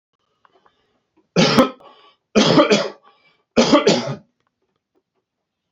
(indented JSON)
{
  "three_cough_length": "5.7 s",
  "three_cough_amplitude": 29525,
  "three_cough_signal_mean_std_ratio": 0.39,
  "survey_phase": "beta (2021-08-13 to 2022-03-07)",
  "age": "45-64",
  "gender": "Male",
  "wearing_mask": "No",
  "symptom_fatigue": true,
  "smoker_status": "Never smoked",
  "respiratory_condition_asthma": false,
  "respiratory_condition_other": false,
  "recruitment_source": "REACT",
  "submission_delay": "1 day",
  "covid_test_result": "Negative",
  "covid_test_method": "RT-qPCR"
}